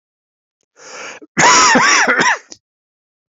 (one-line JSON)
{"cough_length": "3.3 s", "cough_amplitude": 32767, "cough_signal_mean_std_ratio": 0.5, "survey_phase": "beta (2021-08-13 to 2022-03-07)", "age": "45-64", "gender": "Male", "wearing_mask": "No", "symptom_cough_any": true, "symptom_runny_or_blocked_nose": true, "symptom_fatigue": true, "symptom_headache": true, "symptom_onset": "3 days", "smoker_status": "Never smoked", "respiratory_condition_asthma": false, "respiratory_condition_other": false, "recruitment_source": "Test and Trace", "submission_delay": "1 day", "covid_test_result": "Positive", "covid_test_method": "RT-qPCR", "covid_ct_value": 20.3, "covid_ct_gene": "ORF1ab gene", "covid_ct_mean": 21.2, "covid_viral_load": "110000 copies/ml", "covid_viral_load_category": "Low viral load (10K-1M copies/ml)"}